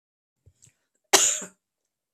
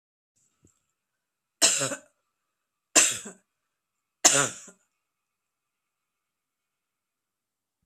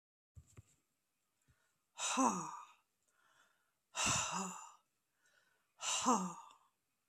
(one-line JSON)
{"cough_length": "2.1 s", "cough_amplitude": 32767, "cough_signal_mean_std_ratio": 0.25, "three_cough_length": "7.9 s", "three_cough_amplitude": 29176, "three_cough_signal_mean_std_ratio": 0.23, "exhalation_length": "7.1 s", "exhalation_amplitude": 3367, "exhalation_signal_mean_std_ratio": 0.39, "survey_phase": "beta (2021-08-13 to 2022-03-07)", "age": "65+", "gender": "Female", "wearing_mask": "No", "symptom_none": true, "smoker_status": "Never smoked", "respiratory_condition_asthma": false, "respiratory_condition_other": false, "recruitment_source": "REACT", "submission_delay": "3 days", "covid_test_result": "Negative", "covid_test_method": "RT-qPCR", "influenza_a_test_result": "Negative", "influenza_b_test_result": "Negative"}